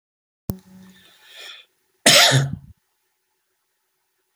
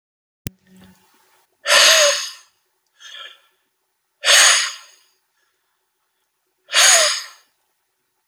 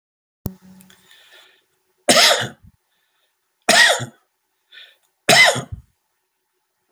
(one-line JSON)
{"cough_length": "4.4 s", "cough_amplitude": 32768, "cough_signal_mean_std_ratio": 0.28, "exhalation_length": "8.3 s", "exhalation_amplitude": 32768, "exhalation_signal_mean_std_ratio": 0.35, "three_cough_length": "6.9 s", "three_cough_amplitude": 32768, "three_cough_signal_mean_std_ratio": 0.32, "survey_phase": "beta (2021-08-13 to 2022-03-07)", "age": "65+", "gender": "Male", "wearing_mask": "No", "symptom_none": true, "smoker_status": "Never smoked", "respiratory_condition_asthma": false, "respiratory_condition_other": false, "recruitment_source": "REACT", "submission_delay": "1 day", "covid_test_result": "Negative", "covid_test_method": "RT-qPCR", "influenza_a_test_result": "Unknown/Void", "influenza_b_test_result": "Unknown/Void"}